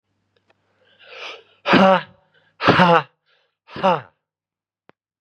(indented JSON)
{
  "exhalation_length": "5.2 s",
  "exhalation_amplitude": 32356,
  "exhalation_signal_mean_std_ratio": 0.34,
  "survey_phase": "beta (2021-08-13 to 2022-03-07)",
  "age": "18-44",
  "gender": "Male",
  "wearing_mask": "No",
  "symptom_cough_any": true,
  "symptom_runny_or_blocked_nose": true,
  "symptom_shortness_of_breath": true,
  "symptom_fatigue": true,
  "symptom_headache": true,
  "symptom_change_to_sense_of_smell_or_taste": true,
  "smoker_status": "Never smoked",
  "respiratory_condition_asthma": false,
  "respiratory_condition_other": false,
  "recruitment_source": "Test and Trace",
  "submission_delay": "2 days",
  "covid_test_result": "Positive",
  "covid_test_method": "RT-qPCR",
  "covid_ct_value": 19.1,
  "covid_ct_gene": "ORF1ab gene",
  "covid_ct_mean": 19.7,
  "covid_viral_load": "350000 copies/ml",
  "covid_viral_load_category": "Low viral load (10K-1M copies/ml)"
}